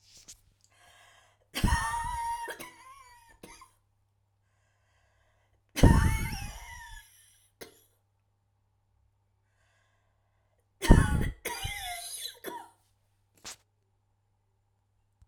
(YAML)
three_cough_length: 15.3 s
three_cough_amplitude: 22765
three_cough_signal_mean_std_ratio: 0.27
survey_phase: alpha (2021-03-01 to 2021-08-12)
age: 45-64
gender: Female
wearing_mask: 'No'
symptom_cough_any: true
symptom_shortness_of_breath: true
symptom_abdominal_pain: true
symptom_diarrhoea: true
symptom_fatigue: true
smoker_status: Ex-smoker
respiratory_condition_asthma: true
respiratory_condition_other: true
recruitment_source: REACT
submission_delay: 1 day
covid_test_result: Negative
covid_test_method: RT-qPCR